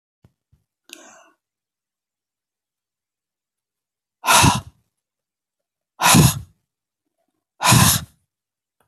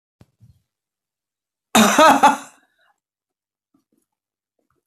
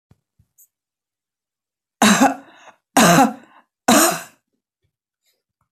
{"exhalation_length": "8.9 s", "exhalation_amplitude": 32768, "exhalation_signal_mean_std_ratio": 0.28, "cough_length": "4.9 s", "cough_amplitude": 29180, "cough_signal_mean_std_ratio": 0.28, "three_cough_length": "5.7 s", "three_cough_amplitude": 29273, "three_cough_signal_mean_std_ratio": 0.33, "survey_phase": "beta (2021-08-13 to 2022-03-07)", "age": "65+", "gender": "Female", "wearing_mask": "No", "symptom_cough_any": true, "symptom_other": true, "symptom_onset": "10 days", "smoker_status": "Never smoked", "respiratory_condition_asthma": false, "respiratory_condition_other": false, "recruitment_source": "REACT", "submission_delay": "1 day", "covid_test_result": "Negative", "covid_test_method": "RT-qPCR", "influenza_a_test_result": "Negative", "influenza_b_test_result": "Negative"}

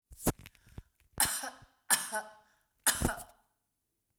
{"three_cough_length": "4.2 s", "three_cough_amplitude": 10167, "three_cough_signal_mean_std_ratio": 0.35, "survey_phase": "beta (2021-08-13 to 2022-03-07)", "age": "45-64", "gender": "Female", "wearing_mask": "No", "symptom_none": true, "smoker_status": "Never smoked", "respiratory_condition_asthma": false, "respiratory_condition_other": false, "recruitment_source": "REACT", "submission_delay": "1 day", "covid_test_result": "Negative", "covid_test_method": "RT-qPCR", "influenza_a_test_result": "Negative", "influenza_b_test_result": "Negative"}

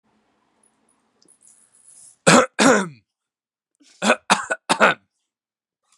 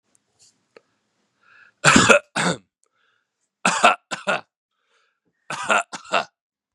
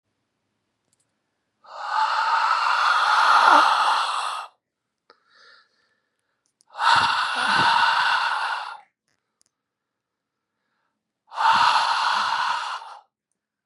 {"cough_length": "6.0 s", "cough_amplitude": 32767, "cough_signal_mean_std_ratio": 0.3, "three_cough_length": "6.7 s", "three_cough_amplitude": 32767, "three_cough_signal_mean_std_ratio": 0.32, "exhalation_length": "13.7 s", "exhalation_amplitude": 27519, "exhalation_signal_mean_std_ratio": 0.56, "survey_phase": "beta (2021-08-13 to 2022-03-07)", "age": "18-44", "gender": "Male", "wearing_mask": "No", "symptom_cough_any": true, "smoker_status": "Ex-smoker", "respiratory_condition_asthma": false, "respiratory_condition_other": false, "recruitment_source": "REACT", "submission_delay": "5 days", "covid_test_result": "Negative", "covid_test_method": "RT-qPCR", "influenza_a_test_result": "Negative", "influenza_b_test_result": "Negative"}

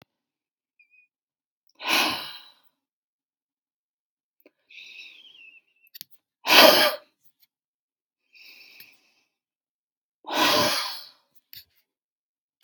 {"exhalation_length": "12.6 s", "exhalation_amplitude": 32627, "exhalation_signal_mean_std_ratio": 0.25, "survey_phase": "beta (2021-08-13 to 2022-03-07)", "age": "65+", "gender": "Female", "wearing_mask": "No", "symptom_cough_any": true, "symptom_shortness_of_breath": true, "symptom_headache": true, "symptom_onset": "12 days", "smoker_status": "Never smoked", "respiratory_condition_asthma": false, "respiratory_condition_other": true, "recruitment_source": "REACT", "submission_delay": "1 day", "covid_test_result": "Negative", "covid_test_method": "RT-qPCR", "influenza_a_test_result": "Negative", "influenza_b_test_result": "Negative"}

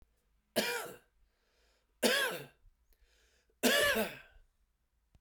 {"three_cough_length": "5.2 s", "three_cough_amplitude": 6830, "three_cough_signal_mean_std_ratio": 0.38, "survey_phase": "beta (2021-08-13 to 2022-03-07)", "age": "45-64", "gender": "Male", "wearing_mask": "No", "symptom_cough_any": true, "symptom_shortness_of_breath": true, "symptom_sore_throat": true, "symptom_fatigue": true, "symptom_headache": true, "symptom_change_to_sense_of_smell_or_taste": true, "symptom_loss_of_taste": true, "symptom_onset": "33 days", "smoker_status": "Ex-smoker", "respiratory_condition_asthma": false, "respiratory_condition_other": false, "recruitment_source": "Test and Trace", "submission_delay": "2 days", "covid_test_result": "Positive", "covid_test_method": "RT-qPCR", "covid_ct_value": 25.4, "covid_ct_gene": "ORF1ab gene"}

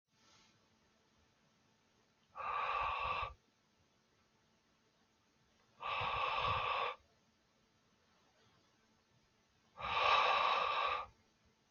{"exhalation_length": "11.7 s", "exhalation_amplitude": 3040, "exhalation_signal_mean_std_ratio": 0.45, "survey_phase": "beta (2021-08-13 to 2022-03-07)", "age": "18-44", "gender": "Male", "wearing_mask": "No", "symptom_none": true, "smoker_status": "Never smoked", "respiratory_condition_asthma": false, "respiratory_condition_other": false, "recruitment_source": "REACT", "submission_delay": "3 days", "covid_test_result": "Negative", "covid_test_method": "RT-qPCR", "influenza_a_test_result": "Negative", "influenza_b_test_result": "Negative"}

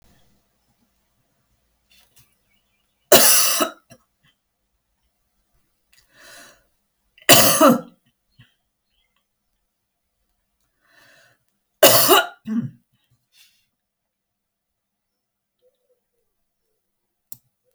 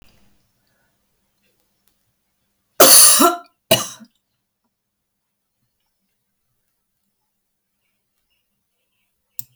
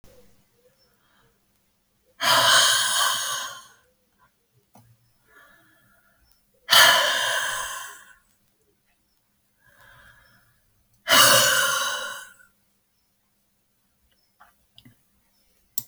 {"three_cough_length": "17.7 s", "three_cough_amplitude": 32768, "three_cough_signal_mean_std_ratio": 0.23, "cough_length": "9.6 s", "cough_amplitude": 32768, "cough_signal_mean_std_ratio": 0.21, "exhalation_length": "15.9 s", "exhalation_amplitude": 27768, "exhalation_signal_mean_std_ratio": 0.35, "survey_phase": "alpha (2021-03-01 to 2021-08-12)", "age": "65+", "gender": "Female", "wearing_mask": "No", "symptom_none": true, "smoker_status": "Ex-smoker", "respiratory_condition_asthma": false, "respiratory_condition_other": false, "recruitment_source": "REACT", "submission_delay": "1 day", "covid_test_result": "Negative", "covid_test_method": "RT-qPCR"}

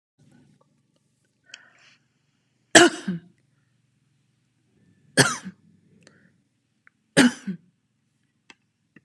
{"three_cough_length": "9.0 s", "three_cough_amplitude": 32740, "three_cough_signal_mean_std_ratio": 0.2, "survey_phase": "alpha (2021-03-01 to 2021-08-12)", "age": "45-64", "gender": "Female", "wearing_mask": "No", "symptom_none": true, "symptom_onset": "12 days", "smoker_status": "Never smoked", "respiratory_condition_asthma": false, "respiratory_condition_other": false, "recruitment_source": "REACT", "submission_delay": "2 days", "covid_test_result": "Negative", "covid_test_method": "RT-qPCR"}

